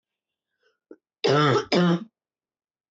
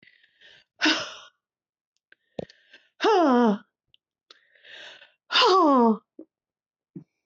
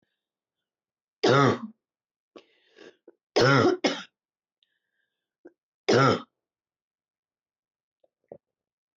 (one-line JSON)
{"cough_length": "2.9 s", "cough_amplitude": 14950, "cough_signal_mean_std_ratio": 0.41, "exhalation_length": "7.3 s", "exhalation_amplitude": 14333, "exhalation_signal_mean_std_ratio": 0.37, "three_cough_length": "9.0 s", "three_cough_amplitude": 14119, "three_cough_signal_mean_std_ratio": 0.29, "survey_phase": "beta (2021-08-13 to 2022-03-07)", "age": "45-64", "gender": "Female", "wearing_mask": "No", "symptom_cough_any": true, "symptom_fever_high_temperature": true, "symptom_headache": true, "symptom_change_to_sense_of_smell_or_taste": true, "symptom_onset": "2 days", "smoker_status": "Ex-smoker", "respiratory_condition_asthma": false, "respiratory_condition_other": false, "recruitment_source": "Test and Trace", "submission_delay": "1 day", "covid_test_result": "Positive", "covid_test_method": "RT-qPCR", "covid_ct_value": 19.0, "covid_ct_gene": "ORF1ab gene", "covid_ct_mean": 19.8, "covid_viral_load": "330000 copies/ml", "covid_viral_load_category": "Low viral load (10K-1M copies/ml)"}